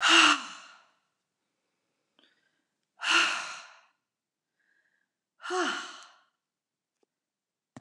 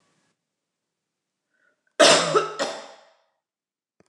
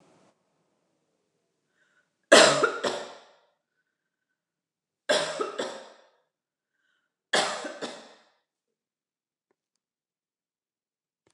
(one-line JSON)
{"exhalation_length": "7.8 s", "exhalation_amplitude": 14943, "exhalation_signal_mean_std_ratio": 0.29, "cough_length": "4.1 s", "cough_amplitude": 27335, "cough_signal_mean_std_ratio": 0.28, "three_cough_length": "11.3 s", "three_cough_amplitude": 25742, "three_cough_signal_mean_std_ratio": 0.23, "survey_phase": "beta (2021-08-13 to 2022-03-07)", "age": "65+", "gender": "Female", "wearing_mask": "No", "symptom_none": true, "smoker_status": "Ex-smoker", "respiratory_condition_asthma": false, "respiratory_condition_other": false, "recruitment_source": "REACT", "submission_delay": "3 days", "covid_test_result": "Negative", "covid_test_method": "RT-qPCR"}